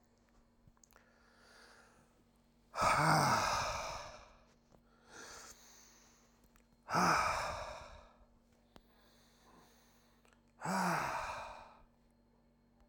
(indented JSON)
{
  "exhalation_length": "12.9 s",
  "exhalation_amplitude": 3870,
  "exhalation_signal_mean_std_ratio": 0.41,
  "survey_phase": "alpha (2021-03-01 to 2021-08-12)",
  "age": "45-64",
  "gender": "Male",
  "wearing_mask": "No",
  "symptom_cough_any": true,
  "symptom_fatigue": true,
  "symptom_change_to_sense_of_smell_or_taste": true,
  "symptom_loss_of_taste": true,
  "symptom_onset": "3 days",
  "smoker_status": "Never smoked",
  "respiratory_condition_asthma": false,
  "respiratory_condition_other": false,
  "recruitment_source": "Test and Trace",
  "submission_delay": "2 days",
  "covid_test_result": "Positive",
  "covid_test_method": "RT-qPCR"
}